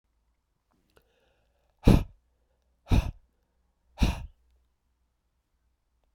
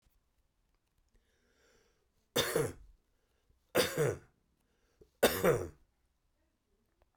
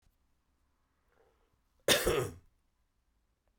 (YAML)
exhalation_length: 6.1 s
exhalation_amplitude: 21455
exhalation_signal_mean_std_ratio: 0.21
three_cough_length: 7.2 s
three_cough_amplitude: 8047
three_cough_signal_mean_std_ratio: 0.3
cough_length: 3.6 s
cough_amplitude: 9520
cough_signal_mean_std_ratio: 0.26
survey_phase: beta (2021-08-13 to 2022-03-07)
age: 45-64
gender: Male
wearing_mask: 'No'
symptom_cough_any: true
symptom_runny_or_blocked_nose: true
symptom_sore_throat: true
symptom_fatigue: true
symptom_headache: true
symptom_change_to_sense_of_smell_or_taste: true
symptom_other: true
symptom_onset: 2 days
smoker_status: Ex-smoker
respiratory_condition_asthma: false
respiratory_condition_other: false
recruitment_source: Test and Trace
submission_delay: 1 day
covid_test_result: Positive
covid_test_method: RT-qPCR
covid_ct_value: 16.9
covid_ct_gene: ORF1ab gene
covid_ct_mean: 17.1
covid_viral_load: 2500000 copies/ml
covid_viral_load_category: High viral load (>1M copies/ml)